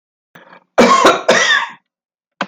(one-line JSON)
{"cough_length": "2.5 s", "cough_amplitude": 31769, "cough_signal_mean_std_ratio": 0.51, "survey_phase": "alpha (2021-03-01 to 2021-08-12)", "age": "45-64", "gender": "Male", "wearing_mask": "No", "symptom_none": true, "smoker_status": "Never smoked", "respiratory_condition_asthma": false, "respiratory_condition_other": false, "recruitment_source": "REACT", "submission_delay": "1 day", "covid_test_result": "Negative", "covid_test_method": "RT-qPCR"}